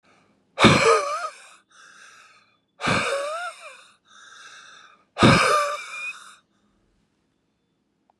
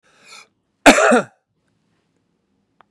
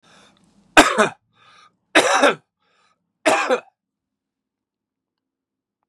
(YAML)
exhalation_length: 8.2 s
exhalation_amplitude: 27660
exhalation_signal_mean_std_ratio: 0.38
cough_length: 2.9 s
cough_amplitude: 32768
cough_signal_mean_std_ratio: 0.27
three_cough_length: 5.9 s
three_cough_amplitude: 32768
three_cough_signal_mean_std_ratio: 0.29
survey_phase: beta (2021-08-13 to 2022-03-07)
age: 45-64
gender: Male
wearing_mask: 'No'
symptom_cough_any: true
symptom_runny_or_blocked_nose: true
symptom_headache: true
symptom_onset: 13 days
smoker_status: Ex-smoker
respiratory_condition_asthma: false
respiratory_condition_other: true
recruitment_source: REACT
submission_delay: 2 days
covid_test_result: Negative
covid_test_method: RT-qPCR